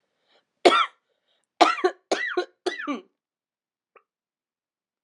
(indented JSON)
{
  "three_cough_length": "5.0 s",
  "three_cough_amplitude": 32018,
  "three_cough_signal_mean_std_ratio": 0.29,
  "survey_phase": "beta (2021-08-13 to 2022-03-07)",
  "age": "18-44",
  "gender": "Female",
  "wearing_mask": "No",
  "symptom_cough_any": true,
  "symptom_runny_or_blocked_nose": true,
  "symptom_sore_throat": true,
  "symptom_fatigue": true,
  "symptom_headache": true,
  "symptom_change_to_sense_of_smell_or_taste": true,
  "smoker_status": "Never smoked",
  "respiratory_condition_asthma": false,
  "respiratory_condition_other": false,
  "recruitment_source": "Test and Trace",
  "submission_delay": "1 day",
  "covid_test_result": "Positive",
  "covid_test_method": "RT-qPCR",
  "covid_ct_value": 28.0,
  "covid_ct_gene": "N gene"
}